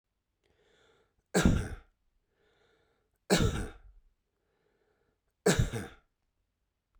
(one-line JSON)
{"three_cough_length": "7.0 s", "three_cough_amplitude": 10783, "three_cough_signal_mean_std_ratio": 0.29, "survey_phase": "beta (2021-08-13 to 2022-03-07)", "age": "45-64", "gender": "Male", "wearing_mask": "No", "symptom_none": true, "smoker_status": "Never smoked", "respiratory_condition_asthma": false, "respiratory_condition_other": false, "recruitment_source": "REACT", "submission_delay": "1 day", "covid_test_result": "Negative", "covid_test_method": "RT-qPCR"}